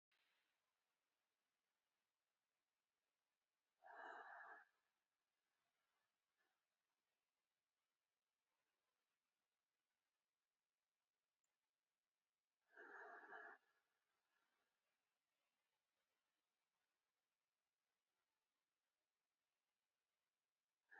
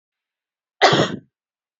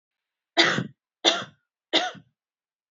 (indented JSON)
{
  "exhalation_length": "21.0 s",
  "exhalation_amplitude": 152,
  "exhalation_signal_mean_std_ratio": 0.25,
  "cough_length": "1.8 s",
  "cough_amplitude": 30014,
  "cough_signal_mean_std_ratio": 0.32,
  "three_cough_length": "2.9 s",
  "three_cough_amplitude": 21150,
  "three_cough_signal_mean_std_ratio": 0.34,
  "survey_phase": "alpha (2021-03-01 to 2021-08-12)",
  "age": "18-44",
  "gender": "Female",
  "wearing_mask": "No",
  "symptom_abdominal_pain": true,
  "symptom_fatigue": true,
  "smoker_status": "Never smoked",
  "respiratory_condition_asthma": false,
  "respiratory_condition_other": false,
  "recruitment_source": "REACT",
  "submission_delay": "2 days",
  "covid_test_result": "Negative",
  "covid_test_method": "RT-qPCR"
}